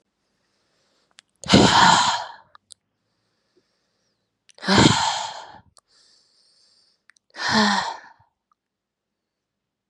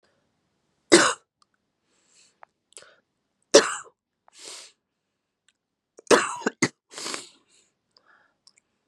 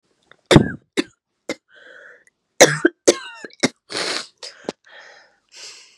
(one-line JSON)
{"exhalation_length": "9.9 s", "exhalation_amplitude": 31033, "exhalation_signal_mean_std_ratio": 0.33, "three_cough_length": "8.9 s", "three_cough_amplitude": 31627, "three_cough_signal_mean_std_ratio": 0.21, "cough_length": "6.0 s", "cough_amplitude": 32768, "cough_signal_mean_std_ratio": 0.26, "survey_phase": "beta (2021-08-13 to 2022-03-07)", "age": "18-44", "gender": "Female", "wearing_mask": "No", "symptom_cough_any": true, "symptom_new_continuous_cough": true, "symptom_runny_or_blocked_nose": true, "symptom_shortness_of_breath": true, "symptom_sore_throat": true, "symptom_fatigue": true, "symptom_fever_high_temperature": true, "symptom_headache": true, "symptom_change_to_sense_of_smell_or_taste": true, "symptom_onset": "4 days", "smoker_status": "Never smoked", "respiratory_condition_asthma": false, "respiratory_condition_other": false, "recruitment_source": "Test and Trace", "submission_delay": "1 day", "covid_test_result": "Positive", "covid_test_method": "RT-qPCR"}